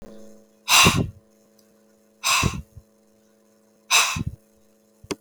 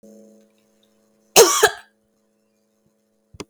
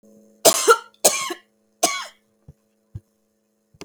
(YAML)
exhalation_length: 5.2 s
exhalation_amplitude: 26432
exhalation_signal_mean_std_ratio: 0.36
cough_length: 3.5 s
cough_amplitude: 32768
cough_signal_mean_std_ratio: 0.23
three_cough_length: 3.8 s
three_cough_amplitude: 32768
three_cough_signal_mean_std_ratio: 0.3
survey_phase: beta (2021-08-13 to 2022-03-07)
age: 45-64
gender: Female
wearing_mask: 'No'
symptom_cough_any: true
symptom_runny_or_blocked_nose: true
symptom_shortness_of_breath: true
symptom_fatigue: true
symptom_headache: true
symptom_change_to_sense_of_smell_or_taste: true
symptom_other: true
symptom_onset: 5 days
smoker_status: Never smoked
respiratory_condition_asthma: true
respiratory_condition_other: false
recruitment_source: Test and Trace
submission_delay: 2 days
covid_test_result: Positive
covid_test_method: RT-qPCR
covid_ct_value: 32.0
covid_ct_gene: ORF1ab gene
covid_ct_mean: 32.4
covid_viral_load: 24 copies/ml
covid_viral_load_category: Minimal viral load (< 10K copies/ml)